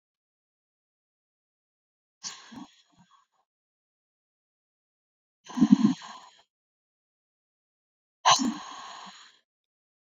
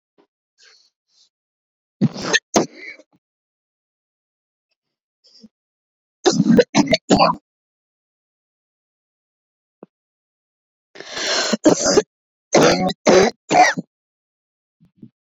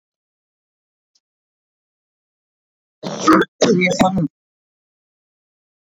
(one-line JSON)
{"exhalation_length": "10.2 s", "exhalation_amplitude": 20973, "exhalation_signal_mean_std_ratio": 0.2, "three_cough_length": "15.3 s", "three_cough_amplitude": 30199, "three_cough_signal_mean_std_ratio": 0.33, "cough_length": "6.0 s", "cough_amplitude": 28947, "cough_signal_mean_std_ratio": 0.31, "survey_phase": "beta (2021-08-13 to 2022-03-07)", "age": "18-44", "gender": "Female", "wearing_mask": "No", "symptom_cough_any": true, "symptom_runny_or_blocked_nose": true, "symptom_shortness_of_breath": true, "symptom_fatigue": true, "symptom_change_to_sense_of_smell_or_taste": true, "symptom_loss_of_taste": true, "symptom_onset": "7 days", "smoker_status": "Never smoked", "respiratory_condition_asthma": false, "respiratory_condition_other": false, "recruitment_source": "Test and Trace", "submission_delay": "1 day", "covid_test_result": "Positive", "covid_test_method": "LAMP"}